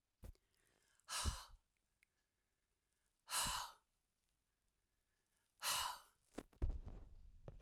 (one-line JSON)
{"exhalation_length": "7.6 s", "exhalation_amplitude": 1207, "exhalation_signal_mean_std_ratio": 0.37, "survey_phase": "alpha (2021-03-01 to 2021-08-12)", "age": "45-64", "gender": "Female", "wearing_mask": "No", "symptom_none": true, "smoker_status": "Ex-smoker", "respiratory_condition_asthma": false, "respiratory_condition_other": false, "recruitment_source": "REACT", "submission_delay": "6 days", "covid_test_result": "Negative", "covid_test_method": "RT-qPCR"}